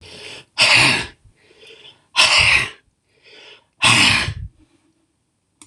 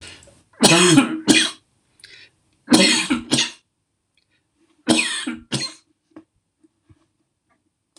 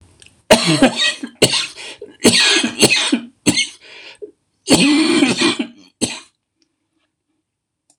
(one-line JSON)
{"exhalation_length": "5.7 s", "exhalation_amplitude": 26028, "exhalation_signal_mean_std_ratio": 0.44, "three_cough_length": "8.0 s", "three_cough_amplitude": 26028, "three_cough_signal_mean_std_ratio": 0.38, "cough_length": "8.0 s", "cough_amplitude": 26028, "cough_signal_mean_std_ratio": 0.51, "survey_phase": "beta (2021-08-13 to 2022-03-07)", "age": "65+", "gender": "Male", "wearing_mask": "No", "symptom_none": true, "smoker_status": "Ex-smoker", "respiratory_condition_asthma": true, "respiratory_condition_other": false, "recruitment_source": "REACT", "submission_delay": "1 day", "covid_test_result": "Negative", "covid_test_method": "RT-qPCR", "influenza_a_test_result": "Negative", "influenza_b_test_result": "Negative"}